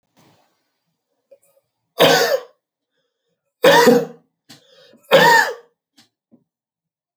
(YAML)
three_cough_length: 7.2 s
three_cough_amplitude: 28698
three_cough_signal_mean_std_ratio: 0.33
survey_phase: alpha (2021-03-01 to 2021-08-12)
age: 65+
gender: Male
wearing_mask: 'No'
symptom_none: true
smoker_status: Never smoked
respiratory_condition_asthma: false
respiratory_condition_other: false
recruitment_source: REACT
submission_delay: 2 days
covid_test_result: Negative
covid_test_method: RT-qPCR